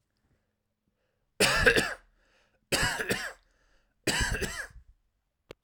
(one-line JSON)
{"three_cough_length": "5.6 s", "three_cough_amplitude": 15397, "three_cough_signal_mean_std_ratio": 0.4, "survey_phase": "alpha (2021-03-01 to 2021-08-12)", "age": "18-44", "gender": "Male", "wearing_mask": "No", "symptom_none": true, "smoker_status": "Never smoked", "respiratory_condition_asthma": false, "respiratory_condition_other": false, "recruitment_source": "REACT", "submission_delay": "1 day", "covid_test_result": "Negative", "covid_test_method": "RT-qPCR"}